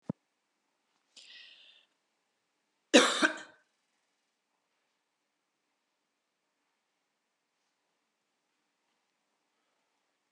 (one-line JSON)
{"cough_length": "10.3 s", "cough_amplitude": 14869, "cough_signal_mean_std_ratio": 0.14, "survey_phase": "alpha (2021-03-01 to 2021-08-12)", "age": "45-64", "gender": "Female", "wearing_mask": "No", "symptom_none": true, "smoker_status": "Never smoked", "respiratory_condition_asthma": false, "respiratory_condition_other": false, "recruitment_source": "REACT", "submission_delay": "3 days", "covid_test_result": "Negative", "covid_test_method": "RT-qPCR"}